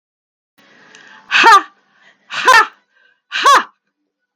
{
  "exhalation_length": "4.4 s",
  "exhalation_amplitude": 32768,
  "exhalation_signal_mean_std_ratio": 0.38,
  "survey_phase": "beta (2021-08-13 to 2022-03-07)",
  "age": "45-64",
  "gender": "Female",
  "wearing_mask": "No",
  "symptom_none": true,
  "smoker_status": "Never smoked",
  "respiratory_condition_asthma": false,
  "respiratory_condition_other": false,
  "recruitment_source": "REACT",
  "submission_delay": "7 days",
  "covid_test_result": "Negative",
  "covid_test_method": "RT-qPCR",
  "influenza_a_test_result": "Negative",
  "influenza_b_test_result": "Negative"
}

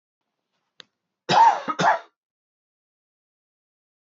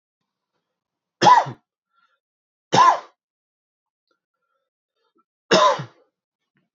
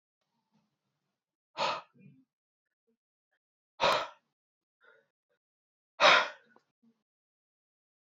{
  "cough_length": "4.1 s",
  "cough_amplitude": 16928,
  "cough_signal_mean_std_ratio": 0.29,
  "three_cough_length": "6.7 s",
  "three_cough_amplitude": 27374,
  "three_cough_signal_mean_std_ratio": 0.27,
  "exhalation_length": "8.0 s",
  "exhalation_amplitude": 12254,
  "exhalation_signal_mean_std_ratio": 0.22,
  "survey_phase": "beta (2021-08-13 to 2022-03-07)",
  "age": "18-44",
  "gender": "Male",
  "wearing_mask": "No",
  "symptom_cough_any": true,
  "symptom_new_continuous_cough": true,
  "symptom_runny_or_blocked_nose": true,
  "symptom_shortness_of_breath": true,
  "symptom_sore_throat": true,
  "symptom_abdominal_pain": true,
  "symptom_fatigue": true,
  "symptom_fever_high_temperature": true,
  "symptom_headache": true,
  "symptom_other": true,
  "smoker_status": "Never smoked",
  "respiratory_condition_asthma": false,
  "respiratory_condition_other": false,
  "recruitment_source": "Test and Trace",
  "submission_delay": "1 day",
  "covid_test_result": "Positive",
  "covid_test_method": "RT-qPCR"
}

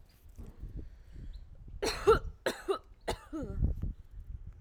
{
  "three_cough_length": "4.6 s",
  "three_cough_amplitude": 7362,
  "three_cough_signal_mean_std_ratio": 0.5,
  "survey_phase": "alpha (2021-03-01 to 2021-08-12)",
  "age": "18-44",
  "gender": "Female",
  "wearing_mask": "No",
  "symptom_cough_any": true,
  "symptom_abdominal_pain": true,
  "symptom_fatigue": true,
  "symptom_fever_high_temperature": true,
  "symptom_headache": true,
  "symptom_onset": "4 days",
  "smoker_status": "Ex-smoker",
  "respiratory_condition_asthma": false,
  "respiratory_condition_other": false,
  "recruitment_source": "Test and Trace",
  "submission_delay": "2 days",
  "covid_test_result": "Positive",
  "covid_test_method": "RT-qPCR",
  "covid_ct_value": 23.8,
  "covid_ct_gene": "ORF1ab gene"
}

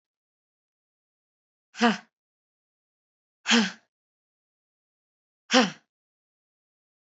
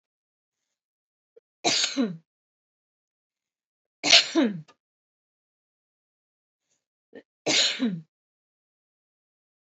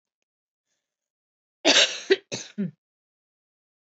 {
  "exhalation_length": "7.1 s",
  "exhalation_amplitude": 21572,
  "exhalation_signal_mean_std_ratio": 0.21,
  "three_cough_length": "9.6 s",
  "three_cough_amplitude": 25316,
  "three_cough_signal_mean_std_ratio": 0.27,
  "cough_length": "3.9 s",
  "cough_amplitude": 19958,
  "cough_signal_mean_std_ratio": 0.27,
  "survey_phase": "beta (2021-08-13 to 2022-03-07)",
  "age": "18-44",
  "gender": "Female",
  "wearing_mask": "No",
  "symptom_none": true,
  "smoker_status": "Never smoked",
  "respiratory_condition_asthma": false,
  "respiratory_condition_other": false,
  "recruitment_source": "REACT",
  "submission_delay": "3 days",
  "covid_test_result": "Negative",
  "covid_test_method": "RT-qPCR",
  "influenza_a_test_result": "Unknown/Void",
  "influenza_b_test_result": "Unknown/Void"
}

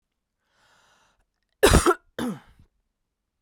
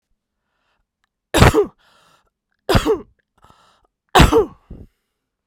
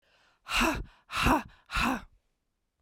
{
  "cough_length": "3.4 s",
  "cough_amplitude": 30537,
  "cough_signal_mean_std_ratio": 0.26,
  "three_cough_length": "5.5 s",
  "three_cough_amplitude": 32768,
  "three_cough_signal_mean_std_ratio": 0.31,
  "exhalation_length": "2.8 s",
  "exhalation_amplitude": 8484,
  "exhalation_signal_mean_std_ratio": 0.48,
  "survey_phase": "beta (2021-08-13 to 2022-03-07)",
  "age": "45-64",
  "gender": "Female",
  "wearing_mask": "No",
  "symptom_cough_any": true,
  "symptom_runny_or_blocked_nose": true,
  "symptom_diarrhoea": true,
  "symptom_fatigue": true,
  "symptom_headache": true,
  "symptom_onset": "5 days",
  "smoker_status": "Never smoked",
  "respiratory_condition_asthma": false,
  "respiratory_condition_other": false,
  "recruitment_source": "Test and Trace",
  "submission_delay": "2 days",
  "covid_test_result": "Positive",
  "covid_test_method": "RT-qPCR",
  "covid_ct_value": 21.4,
  "covid_ct_gene": "ORF1ab gene",
  "covid_ct_mean": 21.7,
  "covid_viral_load": "79000 copies/ml",
  "covid_viral_load_category": "Low viral load (10K-1M copies/ml)"
}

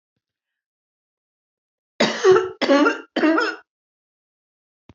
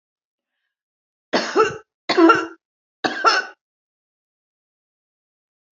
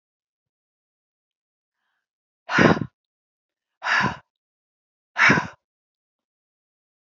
{
  "cough_length": "4.9 s",
  "cough_amplitude": 23665,
  "cough_signal_mean_std_ratio": 0.38,
  "three_cough_length": "5.7 s",
  "three_cough_amplitude": 26873,
  "three_cough_signal_mean_std_ratio": 0.32,
  "exhalation_length": "7.2 s",
  "exhalation_amplitude": 26849,
  "exhalation_signal_mean_std_ratio": 0.26,
  "survey_phase": "alpha (2021-03-01 to 2021-08-12)",
  "age": "65+",
  "gender": "Female",
  "wearing_mask": "No",
  "symptom_none": true,
  "smoker_status": "Ex-smoker",
  "respiratory_condition_asthma": false,
  "respiratory_condition_other": false,
  "recruitment_source": "REACT",
  "submission_delay": "2 days",
  "covid_test_result": "Negative",
  "covid_test_method": "RT-qPCR"
}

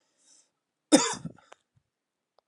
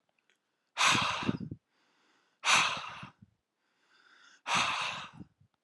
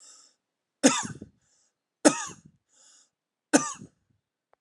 {
  "cough_length": "2.5 s",
  "cough_amplitude": 19739,
  "cough_signal_mean_std_ratio": 0.21,
  "exhalation_length": "5.6 s",
  "exhalation_amplitude": 10230,
  "exhalation_signal_mean_std_ratio": 0.42,
  "three_cough_length": "4.6 s",
  "three_cough_amplitude": 25581,
  "three_cough_signal_mean_std_ratio": 0.23,
  "survey_phase": "alpha (2021-03-01 to 2021-08-12)",
  "age": "18-44",
  "gender": "Male",
  "wearing_mask": "No",
  "symptom_fatigue": true,
  "symptom_onset": "2 days",
  "smoker_status": "Never smoked",
  "respiratory_condition_asthma": false,
  "respiratory_condition_other": false,
  "recruitment_source": "Test and Trace",
  "submission_delay": "2 days",
  "covid_test_result": "Positive",
  "covid_test_method": "RT-qPCR",
  "covid_ct_value": 17.7,
  "covid_ct_gene": "ORF1ab gene",
  "covid_ct_mean": 17.8,
  "covid_viral_load": "1500000 copies/ml",
  "covid_viral_load_category": "High viral load (>1M copies/ml)"
}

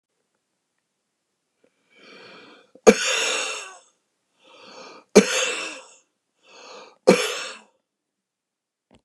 {
  "three_cough_length": "9.0 s",
  "three_cough_amplitude": 29204,
  "three_cough_signal_mean_std_ratio": 0.26,
  "survey_phase": "beta (2021-08-13 to 2022-03-07)",
  "age": "65+",
  "gender": "Male",
  "wearing_mask": "No",
  "symptom_cough_any": true,
  "symptom_onset": "2 days",
  "smoker_status": "Never smoked",
  "respiratory_condition_asthma": false,
  "respiratory_condition_other": false,
  "recruitment_source": "Test and Trace",
  "submission_delay": "1 day",
  "covid_test_result": "Positive",
  "covid_test_method": "RT-qPCR",
  "covid_ct_value": 18.1,
  "covid_ct_gene": "ORF1ab gene",
  "covid_ct_mean": 18.5,
  "covid_viral_load": "880000 copies/ml",
  "covid_viral_load_category": "Low viral load (10K-1M copies/ml)"
}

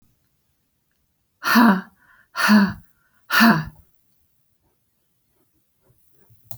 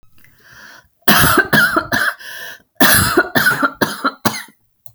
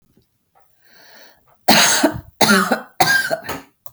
{
  "exhalation_length": "6.6 s",
  "exhalation_amplitude": 24957,
  "exhalation_signal_mean_std_ratio": 0.33,
  "cough_length": "4.9 s",
  "cough_amplitude": 32768,
  "cough_signal_mean_std_ratio": 0.56,
  "three_cough_length": "3.9 s",
  "three_cough_amplitude": 32768,
  "three_cough_signal_mean_std_ratio": 0.47,
  "survey_phase": "beta (2021-08-13 to 2022-03-07)",
  "age": "45-64",
  "gender": "Female",
  "wearing_mask": "No",
  "symptom_none": true,
  "symptom_onset": "12 days",
  "smoker_status": "Ex-smoker",
  "respiratory_condition_asthma": false,
  "respiratory_condition_other": false,
  "recruitment_source": "REACT",
  "submission_delay": "4 days",
  "covid_test_result": "Negative",
  "covid_test_method": "RT-qPCR"
}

